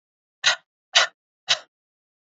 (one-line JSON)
{"three_cough_length": "2.4 s", "three_cough_amplitude": 24024, "three_cough_signal_mean_std_ratio": 0.26, "survey_phase": "beta (2021-08-13 to 2022-03-07)", "age": "18-44", "gender": "Male", "wearing_mask": "No", "symptom_runny_or_blocked_nose": true, "symptom_headache": true, "symptom_other": true, "symptom_onset": "8 days", "smoker_status": "Never smoked", "respiratory_condition_asthma": false, "respiratory_condition_other": false, "recruitment_source": "REACT", "submission_delay": "1 day", "covid_test_result": "Negative", "covid_test_method": "RT-qPCR", "influenza_a_test_result": "Negative", "influenza_b_test_result": "Negative"}